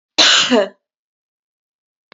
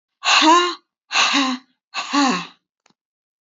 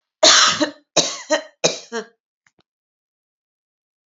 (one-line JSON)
{"cough_length": "2.1 s", "cough_amplitude": 30074, "cough_signal_mean_std_ratio": 0.39, "exhalation_length": "3.4 s", "exhalation_amplitude": 25866, "exhalation_signal_mean_std_ratio": 0.52, "three_cough_length": "4.2 s", "three_cough_amplitude": 32768, "three_cough_signal_mean_std_ratio": 0.34, "survey_phase": "alpha (2021-03-01 to 2021-08-12)", "age": "45-64", "gender": "Female", "wearing_mask": "No", "symptom_none": true, "symptom_onset": "12 days", "smoker_status": "Never smoked", "respiratory_condition_asthma": false, "respiratory_condition_other": false, "recruitment_source": "REACT", "submission_delay": "2 days", "covid_test_result": "Negative", "covid_test_method": "RT-qPCR"}